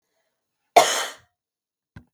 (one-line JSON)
{"cough_length": "2.1 s", "cough_amplitude": 32768, "cough_signal_mean_std_ratio": 0.24, "survey_phase": "beta (2021-08-13 to 2022-03-07)", "age": "18-44", "gender": "Female", "wearing_mask": "No", "symptom_none": true, "smoker_status": "Never smoked", "respiratory_condition_asthma": false, "respiratory_condition_other": false, "recruitment_source": "REACT", "submission_delay": "1 day", "covid_test_result": "Negative", "covid_test_method": "RT-qPCR", "influenza_a_test_result": "Negative", "influenza_b_test_result": "Negative"}